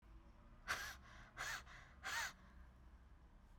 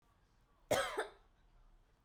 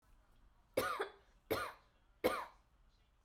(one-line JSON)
{"exhalation_length": "3.6 s", "exhalation_amplitude": 1256, "exhalation_signal_mean_std_ratio": 0.62, "cough_length": "2.0 s", "cough_amplitude": 3034, "cough_signal_mean_std_ratio": 0.34, "three_cough_length": "3.2 s", "three_cough_amplitude": 3678, "three_cough_signal_mean_std_ratio": 0.39, "survey_phase": "beta (2021-08-13 to 2022-03-07)", "age": "18-44", "gender": "Female", "wearing_mask": "Yes", "symptom_fatigue": true, "symptom_headache": true, "symptom_change_to_sense_of_smell_or_taste": true, "symptom_loss_of_taste": true, "symptom_onset": "4 days", "smoker_status": "Never smoked", "respiratory_condition_asthma": false, "respiratory_condition_other": false, "recruitment_source": "Test and Trace", "submission_delay": "4 days", "covid_test_result": "Positive", "covid_test_method": "RT-qPCR", "covid_ct_value": 17.7, "covid_ct_gene": "ORF1ab gene", "covid_ct_mean": 18.2, "covid_viral_load": "1100000 copies/ml", "covid_viral_load_category": "High viral load (>1M copies/ml)"}